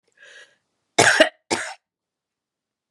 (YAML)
cough_length: 2.9 s
cough_amplitude: 32767
cough_signal_mean_std_ratio: 0.27
survey_phase: beta (2021-08-13 to 2022-03-07)
age: 45-64
gender: Female
wearing_mask: 'No'
symptom_none: true
smoker_status: Never smoked
respiratory_condition_asthma: false
respiratory_condition_other: false
recruitment_source: REACT
submission_delay: 2 days
covid_test_result: Negative
covid_test_method: RT-qPCR